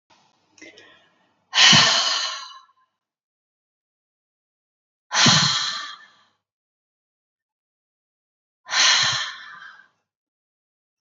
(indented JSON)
{
  "exhalation_length": "11.0 s",
  "exhalation_amplitude": 32767,
  "exhalation_signal_mean_std_ratio": 0.34,
  "survey_phase": "beta (2021-08-13 to 2022-03-07)",
  "age": "45-64",
  "gender": "Female",
  "wearing_mask": "No",
  "symptom_none": true,
  "smoker_status": "Ex-smoker",
  "respiratory_condition_asthma": false,
  "respiratory_condition_other": false,
  "recruitment_source": "REACT",
  "submission_delay": "5 days",
  "covid_test_result": "Negative",
  "covid_test_method": "RT-qPCR",
  "influenza_a_test_result": "Negative",
  "influenza_b_test_result": "Negative"
}